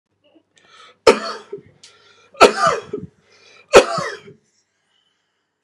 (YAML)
three_cough_length: 5.6 s
three_cough_amplitude: 32768
three_cough_signal_mean_std_ratio: 0.27
survey_phase: beta (2021-08-13 to 2022-03-07)
age: 45-64
gender: Male
wearing_mask: 'No'
symptom_none: true
smoker_status: Never smoked
respiratory_condition_asthma: false
respiratory_condition_other: false
recruitment_source: REACT
submission_delay: 10 days
covid_test_result: Negative
covid_test_method: RT-qPCR
influenza_a_test_result: Unknown/Void
influenza_b_test_result: Unknown/Void